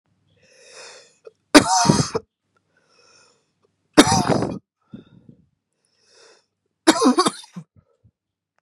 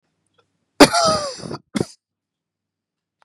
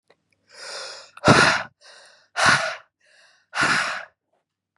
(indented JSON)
{
  "three_cough_length": "8.6 s",
  "three_cough_amplitude": 32768,
  "three_cough_signal_mean_std_ratio": 0.29,
  "cough_length": "3.2 s",
  "cough_amplitude": 32768,
  "cough_signal_mean_std_ratio": 0.28,
  "exhalation_length": "4.8 s",
  "exhalation_amplitude": 30414,
  "exhalation_signal_mean_std_ratio": 0.4,
  "survey_phase": "beta (2021-08-13 to 2022-03-07)",
  "age": "18-44",
  "gender": "Male",
  "wearing_mask": "No",
  "symptom_runny_or_blocked_nose": true,
  "symptom_onset": "12 days",
  "smoker_status": "Prefer not to say",
  "respiratory_condition_asthma": false,
  "respiratory_condition_other": false,
  "recruitment_source": "REACT",
  "submission_delay": "1 day",
  "covid_test_result": "Negative",
  "covid_test_method": "RT-qPCR",
  "influenza_a_test_result": "Negative",
  "influenza_b_test_result": "Negative"
}